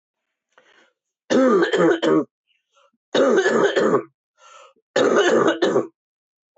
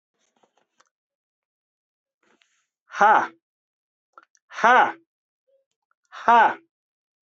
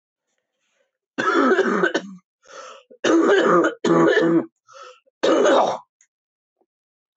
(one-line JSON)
{"three_cough_length": "6.6 s", "three_cough_amplitude": 17526, "three_cough_signal_mean_std_ratio": 0.56, "exhalation_length": "7.3 s", "exhalation_amplitude": 22298, "exhalation_signal_mean_std_ratio": 0.27, "cough_length": "7.2 s", "cough_amplitude": 20562, "cough_signal_mean_std_ratio": 0.55, "survey_phase": "alpha (2021-03-01 to 2021-08-12)", "age": "45-64", "gender": "Male", "wearing_mask": "No", "symptom_cough_any": true, "smoker_status": "Never smoked", "respiratory_condition_asthma": true, "respiratory_condition_other": false, "recruitment_source": "Test and Trace", "submission_delay": "1 day", "covid_test_result": "Positive", "covid_test_method": "RT-qPCR", "covid_ct_value": 14.0, "covid_ct_gene": "ORF1ab gene", "covid_ct_mean": 14.3, "covid_viral_load": "21000000 copies/ml", "covid_viral_load_category": "High viral load (>1M copies/ml)"}